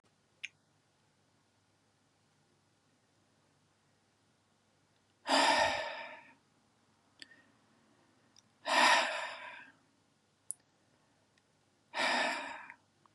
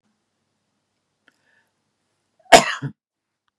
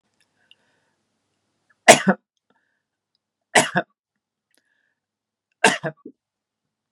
{
  "exhalation_length": "13.1 s",
  "exhalation_amplitude": 6292,
  "exhalation_signal_mean_std_ratio": 0.31,
  "cough_length": "3.6 s",
  "cough_amplitude": 32768,
  "cough_signal_mean_std_ratio": 0.16,
  "three_cough_length": "6.9 s",
  "three_cough_amplitude": 32768,
  "three_cough_signal_mean_std_ratio": 0.19,
  "survey_phase": "beta (2021-08-13 to 2022-03-07)",
  "age": "45-64",
  "gender": "Male",
  "wearing_mask": "No",
  "symptom_fatigue": true,
  "symptom_headache": true,
  "smoker_status": "Never smoked",
  "respiratory_condition_asthma": false,
  "respiratory_condition_other": false,
  "recruitment_source": "Test and Trace",
  "submission_delay": "2 days",
  "covid_test_result": "Positive",
  "covid_test_method": "RT-qPCR"
}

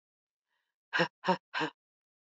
{
  "exhalation_length": "2.2 s",
  "exhalation_amplitude": 6172,
  "exhalation_signal_mean_std_ratio": 0.31,
  "survey_phase": "beta (2021-08-13 to 2022-03-07)",
  "age": "18-44",
  "gender": "Female",
  "wearing_mask": "No",
  "symptom_cough_any": true,
  "symptom_runny_or_blocked_nose": true,
  "symptom_abdominal_pain": true,
  "symptom_fatigue": true,
  "symptom_headache": true,
  "smoker_status": "Never smoked",
  "respiratory_condition_asthma": false,
  "respiratory_condition_other": false,
  "recruitment_source": "Test and Trace",
  "submission_delay": "2 days",
  "covid_test_result": "Positive",
  "covid_test_method": "RT-qPCR"
}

